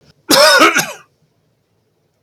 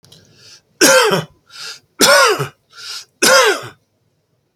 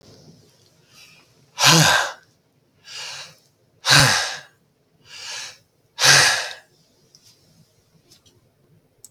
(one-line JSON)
{"cough_length": "2.2 s", "cough_amplitude": 32768, "cough_signal_mean_std_ratio": 0.42, "three_cough_length": "4.6 s", "three_cough_amplitude": 32768, "three_cough_signal_mean_std_ratio": 0.46, "exhalation_length": "9.1 s", "exhalation_amplitude": 32768, "exhalation_signal_mean_std_ratio": 0.33, "survey_phase": "beta (2021-08-13 to 2022-03-07)", "age": "65+", "gender": "Male", "wearing_mask": "No", "symptom_none": true, "smoker_status": "Never smoked", "respiratory_condition_asthma": false, "respiratory_condition_other": false, "recruitment_source": "REACT", "submission_delay": "8 days", "covid_test_result": "Negative", "covid_test_method": "RT-qPCR", "influenza_a_test_result": "Negative", "influenza_b_test_result": "Negative"}